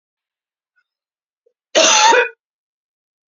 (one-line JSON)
{"cough_length": "3.3 s", "cough_amplitude": 30318, "cough_signal_mean_std_ratio": 0.33, "survey_phase": "beta (2021-08-13 to 2022-03-07)", "age": "18-44", "gender": "Female", "wearing_mask": "No", "symptom_cough_any": true, "symptom_runny_or_blocked_nose": true, "symptom_fatigue": true, "symptom_headache": true, "symptom_other": true, "symptom_onset": "5 days", "smoker_status": "Never smoked", "respiratory_condition_asthma": false, "respiratory_condition_other": false, "recruitment_source": "Test and Trace", "submission_delay": "2 days", "covid_test_result": "Positive", "covid_test_method": "RT-qPCR", "covid_ct_value": 17.6, "covid_ct_gene": "ORF1ab gene", "covid_ct_mean": 17.8, "covid_viral_load": "1400000 copies/ml", "covid_viral_load_category": "High viral load (>1M copies/ml)"}